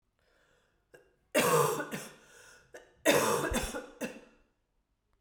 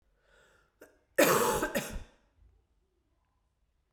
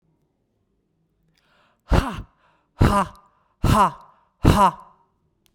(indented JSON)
{
  "three_cough_length": "5.2 s",
  "three_cough_amplitude": 8530,
  "three_cough_signal_mean_std_ratio": 0.43,
  "cough_length": "3.9 s",
  "cough_amplitude": 9896,
  "cough_signal_mean_std_ratio": 0.33,
  "exhalation_length": "5.5 s",
  "exhalation_amplitude": 32768,
  "exhalation_signal_mean_std_ratio": 0.34,
  "survey_phase": "beta (2021-08-13 to 2022-03-07)",
  "age": "18-44",
  "gender": "Female",
  "wearing_mask": "No",
  "symptom_cough_any": true,
  "symptom_runny_or_blocked_nose": true,
  "symptom_shortness_of_breath": true,
  "symptom_fatigue": true,
  "symptom_headache": true,
  "symptom_change_to_sense_of_smell_or_taste": true,
  "smoker_status": "Never smoked",
  "respiratory_condition_asthma": false,
  "respiratory_condition_other": false,
  "recruitment_source": "Test and Trace",
  "submission_delay": "2 days",
  "covid_test_method": "RT-qPCR",
  "covid_ct_value": 21.4,
  "covid_ct_gene": "ORF1ab gene"
}